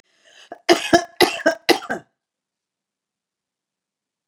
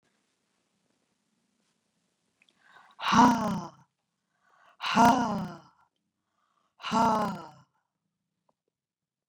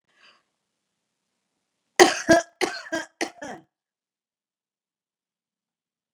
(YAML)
cough_length: 4.3 s
cough_amplitude: 32338
cough_signal_mean_std_ratio: 0.27
exhalation_length: 9.3 s
exhalation_amplitude: 14633
exhalation_signal_mean_std_ratio: 0.31
three_cough_length: 6.1 s
three_cough_amplitude: 32767
three_cough_signal_mean_std_ratio: 0.21
survey_phase: beta (2021-08-13 to 2022-03-07)
age: 65+
gender: Female
wearing_mask: 'No'
symptom_none: true
smoker_status: Never smoked
respiratory_condition_asthma: false
respiratory_condition_other: false
recruitment_source: REACT
submission_delay: 2 days
covid_test_result: Negative
covid_test_method: RT-qPCR